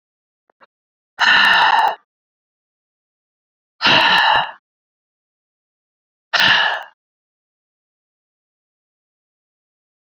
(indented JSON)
{
  "exhalation_length": "10.2 s",
  "exhalation_amplitude": 29591,
  "exhalation_signal_mean_std_ratio": 0.35,
  "survey_phase": "beta (2021-08-13 to 2022-03-07)",
  "age": "45-64",
  "gender": "Female",
  "wearing_mask": "No",
  "symptom_cough_any": true,
  "symptom_abdominal_pain": true,
  "symptom_diarrhoea": true,
  "symptom_onset": "10 days",
  "smoker_status": "Ex-smoker",
  "respiratory_condition_asthma": true,
  "respiratory_condition_other": true,
  "recruitment_source": "Test and Trace",
  "submission_delay": "1 day",
  "covid_test_result": "Positive",
  "covid_test_method": "RT-qPCR",
  "covid_ct_value": 19.5,
  "covid_ct_gene": "ORF1ab gene",
  "covid_ct_mean": 20.0,
  "covid_viral_load": "280000 copies/ml",
  "covid_viral_load_category": "Low viral load (10K-1M copies/ml)"
}